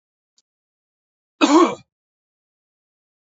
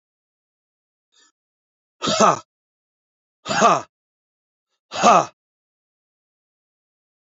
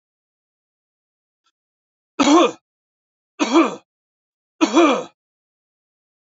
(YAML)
cough_length: 3.2 s
cough_amplitude: 26787
cough_signal_mean_std_ratio: 0.24
exhalation_length: 7.3 s
exhalation_amplitude: 28725
exhalation_signal_mean_std_ratio: 0.26
three_cough_length: 6.3 s
three_cough_amplitude: 26885
three_cough_signal_mean_std_ratio: 0.31
survey_phase: alpha (2021-03-01 to 2021-08-12)
age: 45-64
gender: Male
wearing_mask: 'No'
symptom_none: true
smoker_status: Never smoked
respiratory_condition_asthma: false
respiratory_condition_other: false
recruitment_source: REACT
submission_delay: 1 day
covid_test_result: Negative
covid_test_method: RT-qPCR